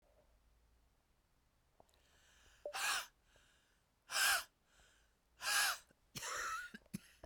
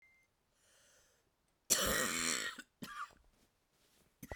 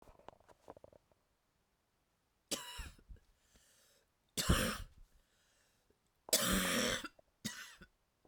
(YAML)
exhalation_length: 7.3 s
exhalation_amplitude: 2410
exhalation_signal_mean_std_ratio: 0.38
cough_length: 4.4 s
cough_amplitude: 6796
cough_signal_mean_std_ratio: 0.39
three_cough_length: 8.3 s
three_cough_amplitude: 5484
three_cough_signal_mean_std_ratio: 0.34
survey_phase: beta (2021-08-13 to 2022-03-07)
age: 45-64
gender: Female
wearing_mask: 'No'
symptom_cough_any: true
symptom_shortness_of_breath: true
symptom_sore_throat: true
symptom_fatigue: true
symptom_headache: true
symptom_change_to_sense_of_smell_or_taste: true
symptom_onset: 3 days
smoker_status: Ex-smoker
respiratory_condition_asthma: false
respiratory_condition_other: false
recruitment_source: Test and Trace
submission_delay: 2 days
covid_test_result: Positive
covid_test_method: RT-qPCR
covid_ct_value: 24.6
covid_ct_gene: N gene